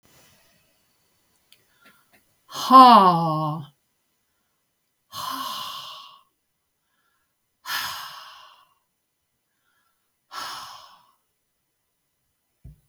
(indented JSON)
{
  "exhalation_length": "12.9 s",
  "exhalation_amplitude": 32768,
  "exhalation_signal_mean_std_ratio": 0.23,
  "survey_phase": "beta (2021-08-13 to 2022-03-07)",
  "age": "65+",
  "gender": "Female",
  "wearing_mask": "No",
  "symptom_none": true,
  "smoker_status": "Never smoked",
  "respiratory_condition_asthma": false,
  "respiratory_condition_other": false,
  "recruitment_source": "REACT",
  "submission_delay": "1 day",
  "covid_test_result": "Negative",
  "covid_test_method": "RT-qPCR"
}